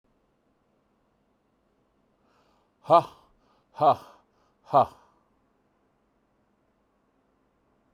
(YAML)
exhalation_length: 7.9 s
exhalation_amplitude: 18549
exhalation_signal_mean_std_ratio: 0.18
survey_phase: beta (2021-08-13 to 2022-03-07)
age: 45-64
gender: Male
wearing_mask: 'No'
symptom_none: true
symptom_onset: 12 days
smoker_status: Ex-smoker
respiratory_condition_asthma: false
respiratory_condition_other: false
recruitment_source: REACT
submission_delay: 1 day
covid_test_method: RT-qPCR